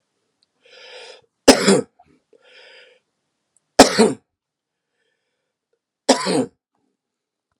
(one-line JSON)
{"three_cough_length": "7.6 s", "three_cough_amplitude": 32768, "three_cough_signal_mean_std_ratio": 0.24, "survey_phase": "alpha (2021-03-01 to 2021-08-12)", "age": "65+", "gender": "Male", "wearing_mask": "No", "symptom_cough_any": true, "symptom_headache": true, "symptom_onset": "4 days", "smoker_status": "Never smoked", "respiratory_condition_asthma": false, "respiratory_condition_other": false, "recruitment_source": "Test and Trace", "submission_delay": "2 days", "covid_test_result": "Positive", "covid_test_method": "RT-qPCR", "covid_ct_value": 22.1, "covid_ct_gene": "N gene", "covid_ct_mean": 22.3, "covid_viral_load": "50000 copies/ml", "covid_viral_load_category": "Low viral load (10K-1M copies/ml)"}